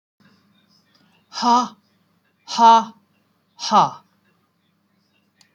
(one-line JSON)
{"exhalation_length": "5.5 s", "exhalation_amplitude": 25767, "exhalation_signal_mean_std_ratio": 0.3, "survey_phase": "beta (2021-08-13 to 2022-03-07)", "age": "45-64", "gender": "Female", "wearing_mask": "No", "symptom_none": true, "smoker_status": "Ex-smoker", "respiratory_condition_asthma": false, "respiratory_condition_other": false, "recruitment_source": "REACT", "submission_delay": "2 days", "covid_test_result": "Negative", "covid_test_method": "RT-qPCR", "influenza_a_test_result": "Negative", "influenza_b_test_result": "Negative"}